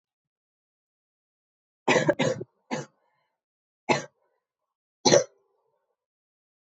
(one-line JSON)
{"three_cough_length": "6.7 s", "three_cough_amplitude": 19604, "three_cough_signal_mean_std_ratio": 0.25, "survey_phase": "alpha (2021-03-01 to 2021-08-12)", "age": "18-44", "gender": "Female", "wearing_mask": "No", "symptom_cough_any": true, "symptom_fatigue": true, "symptom_fever_high_temperature": true, "symptom_headache": true, "symptom_onset": "4 days", "smoker_status": "Never smoked", "respiratory_condition_asthma": false, "respiratory_condition_other": false, "recruitment_source": "Test and Trace", "submission_delay": "2 days", "covid_test_result": "Positive", "covid_test_method": "RT-qPCR", "covid_ct_value": 16.0, "covid_ct_gene": "ORF1ab gene", "covid_ct_mean": 16.6, "covid_viral_load": "3700000 copies/ml", "covid_viral_load_category": "High viral load (>1M copies/ml)"}